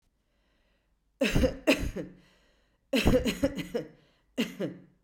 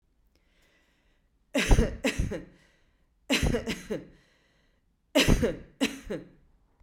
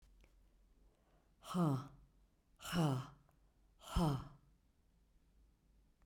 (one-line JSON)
{"cough_length": "5.0 s", "cough_amplitude": 10075, "cough_signal_mean_std_ratio": 0.43, "three_cough_length": "6.8 s", "three_cough_amplitude": 14049, "three_cough_signal_mean_std_ratio": 0.39, "exhalation_length": "6.1 s", "exhalation_amplitude": 2006, "exhalation_signal_mean_std_ratio": 0.37, "survey_phase": "beta (2021-08-13 to 2022-03-07)", "age": "45-64", "gender": "Female", "wearing_mask": "No", "symptom_none": true, "smoker_status": "Ex-smoker", "respiratory_condition_asthma": false, "respiratory_condition_other": false, "recruitment_source": "REACT", "submission_delay": "2 days", "covid_test_method": "RT-qPCR", "influenza_a_test_result": "Unknown/Void", "influenza_b_test_result": "Unknown/Void"}